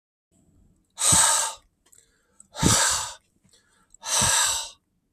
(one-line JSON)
{"exhalation_length": "5.1 s", "exhalation_amplitude": 20423, "exhalation_signal_mean_std_ratio": 0.46, "survey_phase": "beta (2021-08-13 to 2022-03-07)", "age": "65+", "gender": "Male", "wearing_mask": "No", "symptom_runny_or_blocked_nose": true, "symptom_onset": "12 days", "smoker_status": "Ex-smoker", "respiratory_condition_asthma": false, "respiratory_condition_other": true, "recruitment_source": "REACT", "submission_delay": "1 day", "covid_test_result": "Negative", "covid_test_method": "RT-qPCR", "influenza_a_test_result": "Negative", "influenza_b_test_result": "Negative"}